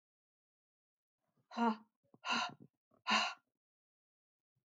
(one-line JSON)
{"exhalation_length": "4.7 s", "exhalation_amplitude": 3423, "exhalation_signal_mean_std_ratio": 0.3, "survey_phase": "beta (2021-08-13 to 2022-03-07)", "age": "45-64", "gender": "Female", "wearing_mask": "No", "symptom_cough_any": true, "symptom_new_continuous_cough": true, "symptom_sore_throat": true, "symptom_fatigue": true, "symptom_fever_high_temperature": true, "symptom_headache": true, "symptom_onset": "2 days", "smoker_status": "Never smoked", "respiratory_condition_asthma": false, "respiratory_condition_other": false, "recruitment_source": "Test and Trace", "submission_delay": "2 days", "covid_test_result": "Positive", "covid_test_method": "RT-qPCR", "covid_ct_value": 31.5, "covid_ct_gene": "ORF1ab gene"}